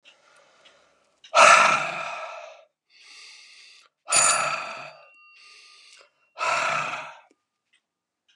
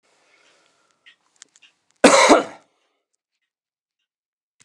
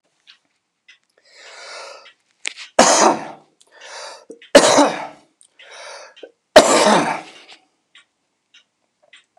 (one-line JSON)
{"exhalation_length": "8.4 s", "exhalation_amplitude": 28383, "exhalation_signal_mean_std_ratio": 0.36, "cough_length": "4.6 s", "cough_amplitude": 32768, "cough_signal_mean_std_ratio": 0.23, "three_cough_length": "9.4 s", "three_cough_amplitude": 32768, "three_cough_signal_mean_std_ratio": 0.32, "survey_phase": "beta (2021-08-13 to 2022-03-07)", "age": "65+", "gender": "Male", "wearing_mask": "No", "symptom_none": true, "smoker_status": "Never smoked", "respiratory_condition_asthma": false, "respiratory_condition_other": false, "recruitment_source": "REACT", "submission_delay": "8 days", "covid_test_result": "Negative", "covid_test_method": "RT-qPCR", "influenza_a_test_result": "Negative", "influenza_b_test_result": "Negative"}